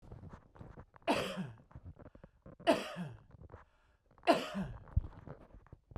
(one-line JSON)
{"three_cough_length": "6.0 s", "three_cough_amplitude": 6276, "three_cough_signal_mean_std_ratio": 0.38, "survey_phase": "beta (2021-08-13 to 2022-03-07)", "age": "45-64", "gender": "Male", "wearing_mask": "No", "symptom_cough_any": true, "symptom_sore_throat": true, "symptom_onset": "2 days", "smoker_status": "Never smoked", "respiratory_condition_asthma": false, "respiratory_condition_other": false, "recruitment_source": "REACT", "submission_delay": "3 days", "covid_test_result": "Negative", "covid_test_method": "RT-qPCR", "influenza_a_test_result": "Negative", "influenza_b_test_result": "Negative"}